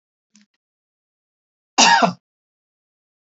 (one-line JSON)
{"cough_length": "3.3 s", "cough_amplitude": 32768, "cough_signal_mean_std_ratio": 0.25, "survey_phase": "beta (2021-08-13 to 2022-03-07)", "age": "65+", "gender": "Female", "wearing_mask": "No", "symptom_none": true, "smoker_status": "Ex-smoker", "respiratory_condition_asthma": false, "respiratory_condition_other": false, "recruitment_source": "REACT", "submission_delay": "1 day", "covid_test_result": "Negative", "covid_test_method": "RT-qPCR", "influenza_a_test_result": "Negative", "influenza_b_test_result": "Negative"}